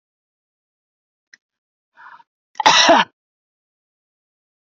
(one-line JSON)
{"cough_length": "4.6 s", "cough_amplitude": 32768, "cough_signal_mean_std_ratio": 0.24, "survey_phase": "beta (2021-08-13 to 2022-03-07)", "age": "45-64", "gender": "Female", "wearing_mask": "No", "symptom_none": true, "symptom_onset": "2 days", "smoker_status": "Ex-smoker", "respiratory_condition_asthma": false, "respiratory_condition_other": false, "recruitment_source": "REACT", "submission_delay": "5 days", "covid_test_result": "Negative", "covid_test_method": "RT-qPCR"}